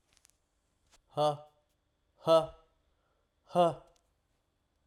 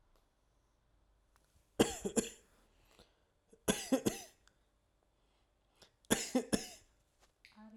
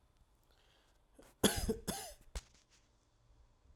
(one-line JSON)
{"exhalation_length": "4.9 s", "exhalation_amplitude": 7064, "exhalation_signal_mean_std_ratio": 0.28, "three_cough_length": "7.8 s", "three_cough_amplitude": 6907, "three_cough_signal_mean_std_ratio": 0.27, "cough_length": "3.8 s", "cough_amplitude": 6192, "cough_signal_mean_std_ratio": 0.29, "survey_phase": "alpha (2021-03-01 to 2021-08-12)", "age": "18-44", "gender": "Male", "wearing_mask": "No", "symptom_none": true, "smoker_status": "Never smoked", "respiratory_condition_asthma": false, "respiratory_condition_other": false, "recruitment_source": "REACT", "submission_delay": "2 days", "covid_test_result": "Negative", "covid_test_method": "RT-qPCR"}